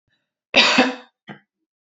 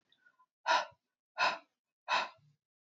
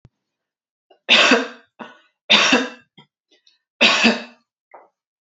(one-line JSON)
{"cough_length": "2.0 s", "cough_amplitude": 29506, "cough_signal_mean_std_ratio": 0.35, "exhalation_length": "2.9 s", "exhalation_amplitude": 5155, "exhalation_signal_mean_std_ratio": 0.34, "three_cough_length": "5.2 s", "three_cough_amplitude": 31229, "three_cough_signal_mean_std_ratio": 0.38, "survey_phase": "beta (2021-08-13 to 2022-03-07)", "age": "18-44", "gender": "Female", "wearing_mask": "No", "symptom_none": true, "smoker_status": "Ex-smoker", "respiratory_condition_asthma": false, "respiratory_condition_other": false, "recruitment_source": "REACT", "submission_delay": "1 day", "covid_test_result": "Negative", "covid_test_method": "RT-qPCR", "influenza_a_test_result": "Negative", "influenza_b_test_result": "Negative"}